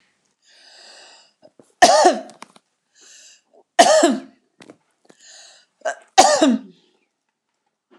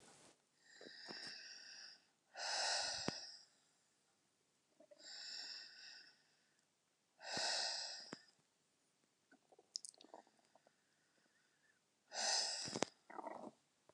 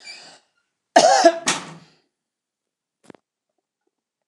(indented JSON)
{
  "three_cough_length": "8.0 s",
  "three_cough_amplitude": 29204,
  "three_cough_signal_mean_std_ratio": 0.32,
  "exhalation_length": "13.9 s",
  "exhalation_amplitude": 6409,
  "exhalation_signal_mean_std_ratio": 0.43,
  "cough_length": "4.3 s",
  "cough_amplitude": 29204,
  "cough_signal_mean_std_ratio": 0.27,
  "survey_phase": "beta (2021-08-13 to 2022-03-07)",
  "age": "65+",
  "gender": "Female",
  "wearing_mask": "No",
  "symptom_none": true,
  "smoker_status": "Never smoked",
  "respiratory_condition_asthma": true,
  "respiratory_condition_other": false,
  "recruitment_source": "REACT",
  "submission_delay": "1 day",
  "covid_test_result": "Negative",
  "covid_test_method": "RT-qPCR"
}